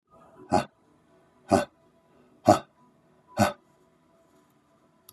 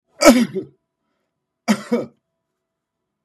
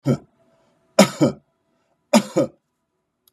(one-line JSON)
{"exhalation_length": "5.1 s", "exhalation_amplitude": 21797, "exhalation_signal_mean_std_ratio": 0.23, "cough_length": "3.2 s", "cough_amplitude": 32768, "cough_signal_mean_std_ratio": 0.29, "three_cough_length": "3.3 s", "three_cough_amplitude": 32647, "three_cough_signal_mean_std_ratio": 0.3, "survey_phase": "beta (2021-08-13 to 2022-03-07)", "age": "45-64", "gender": "Male", "wearing_mask": "No", "symptom_none": true, "smoker_status": "Ex-smoker", "respiratory_condition_asthma": false, "respiratory_condition_other": false, "recruitment_source": "REACT", "submission_delay": "0 days", "covid_test_result": "Negative", "covid_test_method": "RT-qPCR", "influenza_a_test_result": "Unknown/Void", "influenza_b_test_result": "Unknown/Void"}